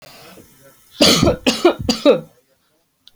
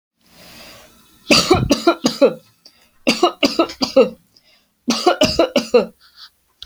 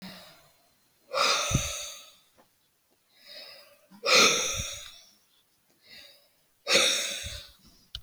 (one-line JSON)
{"cough_length": "3.2 s", "cough_amplitude": 32768, "cough_signal_mean_std_ratio": 0.42, "three_cough_length": "6.7 s", "three_cough_amplitude": 32768, "three_cough_signal_mean_std_ratio": 0.44, "exhalation_length": "8.0 s", "exhalation_amplitude": 15359, "exhalation_signal_mean_std_ratio": 0.4, "survey_phase": "alpha (2021-03-01 to 2021-08-12)", "age": "45-64", "gender": "Female", "wearing_mask": "No", "symptom_none": true, "smoker_status": "Never smoked", "respiratory_condition_asthma": false, "respiratory_condition_other": false, "recruitment_source": "REACT", "submission_delay": "9 days", "covid_test_result": "Negative", "covid_test_method": "RT-qPCR"}